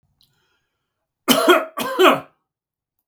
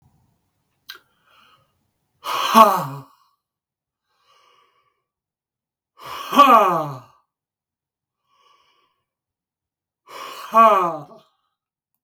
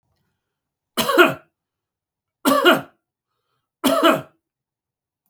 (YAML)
cough_length: 3.1 s
cough_amplitude: 32768
cough_signal_mean_std_ratio: 0.36
exhalation_length: 12.0 s
exhalation_amplitude: 32768
exhalation_signal_mean_std_ratio: 0.28
three_cough_length: 5.3 s
three_cough_amplitude: 32768
three_cough_signal_mean_std_ratio: 0.34
survey_phase: beta (2021-08-13 to 2022-03-07)
age: 65+
gender: Male
wearing_mask: 'No'
symptom_none: true
smoker_status: Ex-smoker
respiratory_condition_asthma: false
respiratory_condition_other: false
recruitment_source: REACT
submission_delay: 0 days
covid_test_result: Negative
covid_test_method: RT-qPCR
influenza_a_test_result: Negative
influenza_b_test_result: Negative